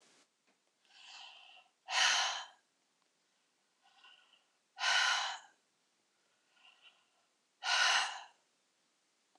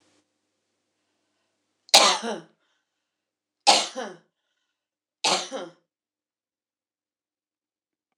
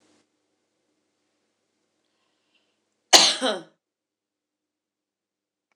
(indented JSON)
{
  "exhalation_length": "9.4 s",
  "exhalation_amplitude": 5006,
  "exhalation_signal_mean_std_ratio": 0.35,
  "three_cough_length": "8.2 s",
  "three_cough_amplitude": 26028,
  "three_cough_signal_mean_std_ratio": 0.23,
  "cough_length": "5.8 s",
  "cough_amplitude": 26028,
  "cough_signal_mean_std_ratio": 0.17,
  "survey_phase": "beta (2021-08-13 to 2022-03-07)",
  "age": "45-64",
  "gender": "Female",
  "wearing_mask": "No",
  "symptom_none": true,
  "smoker_status": "Never smoked",
  "respiratory_condition_asthma": false,
  "respiratory_condition_other": false,
  "recruitment_source": "REACT",
  "submission_delay": "1 day",
  "covid_test_result": "Negative",
  "covid_test_method": "RT-qPCR",
  "influenza_a_test_result": "Unknown/Void",
  "influenza_b_test_result": "Unknown/Void"
}